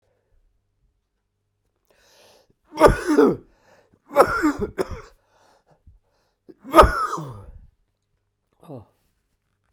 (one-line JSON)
{"cough_length": "9.7 s", "cough_amplitude": 32768, "cough_signal_mean_std_ratio": 0.28, "survey_phase": "beta (2021-08-13 to 2022-03-07)", "age": "65+", "gender": "Male", "wearing_mask": "No", "symptom_cough_any": true, "symptom_new_continuous_cough": true, "symptom_runny_or_blocked_nose": true, "symptom_headache": true, "symptom_onset": "6 days", "smoker_status": "Never smoked", "respiratory_condition_asthma": false, "respiratory_condition_other": false, "recruitment_source": "Test and Trace", "submission_delay": "1 day", "covid_test_result": "Positive", "covid_test_method": "RT-qPCR"}